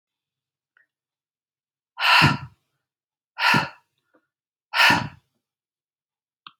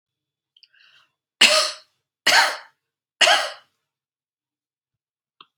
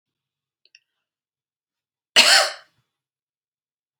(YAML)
exhalation_length: 6.6 s
exhalation_amplitude: 25012
exhalation_signal_mean_std_ratio: 0.3
three_cough_length: 5.6 s
three_cough_amplitude: 30605
three_cough_signal_mean_std_ratio: 0.3
cough_length: 4.0 s
cough_amplitude: 29664
cough_signal_mean_std_ratio: 0.22
survey_phase: beta (2021-08-13 to 2022-03-07)
age: 45-64
gender: Female
wearing_mask: 'No'
symptom_none: true
smoker_status: Never smoked
respiratory_condition_asthma: false
respiratory_condition_other: false
recruitment_source: REACT
submission_delay: 1 day
covid_test_result: Negative
covid_test_method: RT-qPCR